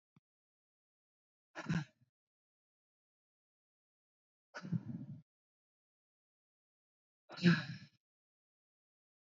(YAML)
exhalation_length: 9.2 s
exhalation_amplitude: 4238
exhalation_signal_mean_std_ratio: 0.2
survey_phase: beta (2021-08-13 to 2022-03-07)
age: 45-64
gender: Female
wearing_mask: 'Yes'
symptom_cough_any: true
symptom_runny_or_blocked_nose: true
symptom_fatigue: true
symptom_headache: true
symptom_loss_of_taste: true
symptom_other: true
smoker_status: Current smoker (e-cigarettes or vapes only)
respiratory_condition_asthma: false
respiratory_condition_other: false
recruitment_source: Test and Trace
submission_delay: 2 days
covid_test_result: Positive
covid_test_method: RT-qPCR
covid_ct_value: 19.3
covid_ct_gene: ORF1ab gene
covid_ct_mean: 19.7
covid_viral_load: 350000 copies/ml
covid_viral_load_category: Low viral load (10K-1M copies/ml)